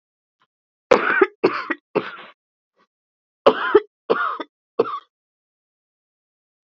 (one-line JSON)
{"cough_length": "6.7 s", "cough_amplitude": 29454, "cough_signal_mean_std_ratio": 0.31, "survey_phase": "beta (2021-08-13 to 2022-03-07)", "age": "45-64", "gender": "Female", "wearing_mask": "No", "symptom_none": true, "symptom_onset": "12 days", "smoker_status": "Prefer not to say", "respiratory_condition_asthma": true, "respiratory_condition_other": true, "recruitment_source": "REACT", "submission_delay": "6 days", "covid_test_result": "Negative", "covid_test_method": "RT-qPCR", "influenza_a_test_result": "Negative", "influenza_b_test_result": "Negative"}